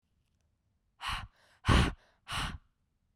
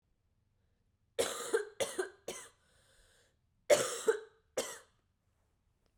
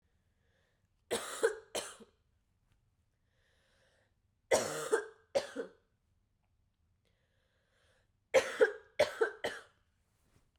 {"exhalation_length": "3.2 s", "exhalation_amplitude": 7895, "exhalation_signal_mean_std_ratio": 0.33, "cough_length": "6.0 s", "cough_amplitude": 6621, "cough_signal_mean_std_ratio": 0.32, "three_cough_length": "10.6 s", "three_cough_amplitude": 6385, "three_cough_signal_mean_std_ratio": 0.29, "survey_phase": "beta (2021-08-13 to 2022-03-07)", "age": "18-44", "gender": "Female", "wearing_mask": "No", "symptom_cough_any": true, "symptom_runny_or_blocked_nose": true, "symptom_sore_throat": true, "symptom_diarrhoea": true, "symptom_fatigue": true, "symptom_headache": true, "symptom_change_to_sense_of_smell_or_taste": true, "smoker_status": "Ex-smoker", "respiratory_condition_asthma": false, "respiratory_condition_other": false, "recruitment_source": "Test and Trace", "submission_delay": "1 day", "covid_test_result": "Positive", "covid_test_method": "RT-qPCR", "covid_ct_value": 22.0, "covid_ct_gene": "ORF1ab gene"}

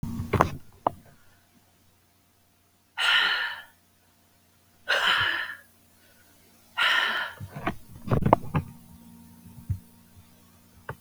{"exhalation_length": "11.0 s", "exhalation_amplitude": 32766, "exhalation_signal_mean_std_ratio": 0.42, "survey_phase": "beta (2021-08-13 to 2022-03-07)", "age": "45-64", "gender": "Female", "wearing_mask": "No", "symptom_cough_any": true, "symptom_runny_or_blocked_nose": true, "symptom_sore_throat": true, "symptom_headache": true, "symptom_change_to_sense_of_smell_or_taste": true, "symptom_loss_of_taste": true, "symptom_onset": "6 days", "smoker_status": "Never smoked", "respiratory_condition_asthma": false, "respiratory_condition_other": false, "recruitment_source": "Test and Trace", "submission_delay": "2 days", "covid_test_result": "Positive", "covid_test_method": "RT-qPCR", "covid_ct_value": 12.5, "covid_ct_gene": "ORF1ab gene", "covid_ct_mean": 12.9, "covid_viral_load": "60000000 copies/ml", "covid_viral_load_category": "High viral load (>1M copies/ml)"}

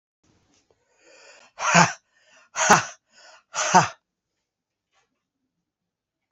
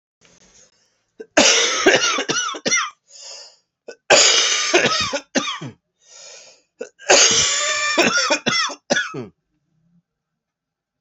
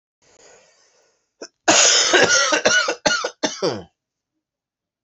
{"exhalation_length": "6.3 s", "exhalation_amplitude": 31285, "exhalation_signal_mean_std_ratio": 0.27, "three_cough_length": "11.0 s", "three_cough_amplitude": 32767, "three_cough_signal_mean_std_ratio": 0.52, "cough_length": "5.0 s", "cough_amplitude": 31447, "cough_signal_mean_std_ratio": 0.48, "survey_phase": "alpha (2021-03-01 to 2021-08-12)", "age": "45-64", "gender": "Male", "wearing_mask": "No", "symptom_new_continuous_cough": true, "symptom_fatigue": true, "symptom_headache": true, "symptom_change_to_sense_of_smell_or_taste": true, "symptom_loss_of_taste": true, "symptom_onset": "4 days", "smoker_status": "Never smoked", "respiratory_condition_asthma": false, "respiratory_condition_other": false, "recruitment_source": "Test and Trace", "submission_delay": "2 days", "covid_test_result": "Positive", "covid_test_method": "RT-qPCR"}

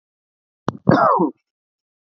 {"cough_length": "2.1 s", "cough_amplitude": 27639, "cough_signal_mean_std_ratio": 0.36, "survey_phase": "beta (2021-08-13 to 2022-03-07)", "age": "45-64", "gender": "Male", "wearing_mask": "No", "symptom_none": true, "smoker_status": "Never smoked", "respiratory_condition_asthma": false, "respiratory_condition_other": false, "recruitment_source": "REACT", "submission_delay": "1 day", "covid_test_result": "Negative", "covid_test_method": "RT-qPCR", "influenza_a_test_result": "Negative", "influenza_b_test_result": "Negative"}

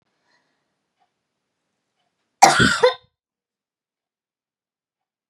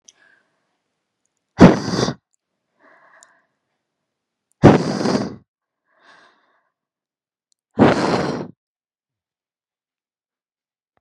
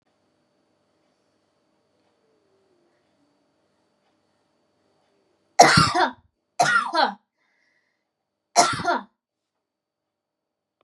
{"cough_length": "5.3 s", "cough_amplitude": 32768, "cough_signal_mean_std_ratio": 0.22, "exhalation_length": "11.0 s", "exhalation_amplitude": 32768, "exhalation_signal_mean_std_ratio": 0.25, "three_cough_length": "10.8 s", "three_cough_amplitude": 32583, "three_cough_signal_mean_std_ratio": 0.25, "survey_phase": "beta (2021-08-13 to 2022-03-07)", "age": "18-44", "gender": "Female", "wearing_mask": "No", "symptom_sore_throat": true, "symptom_onset": "5 days", "smoker_status": "Current smoker (1 to 10 cigarettes per day)", "respiratory_condition_asthma": false, "respiratory_condition_other": false, "recruitment_source": "Test and Trace", "submission_delay": "3 days", "covid_test_result": "Negative", "covid_test_method": "RT-qPCR"}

